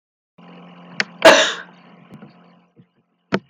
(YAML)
cough_length: 3.5 s
cough_amplitude: 32767
cough_signal_mean_std_ratio: 0.26
survey_phase: alpha (2021-03-01 to 2021-08-12)
age: 65+
gender: Female
wearing_mask: 'No'
symptom_none: true
smoker_status: Never smoked
respiratory_condition_asthma: false
respiratory_condition_other: true
recruitment_source: REACT
submission_delay: 2 days
covid_test_result: Negative
covid_test_method: RT-qPCR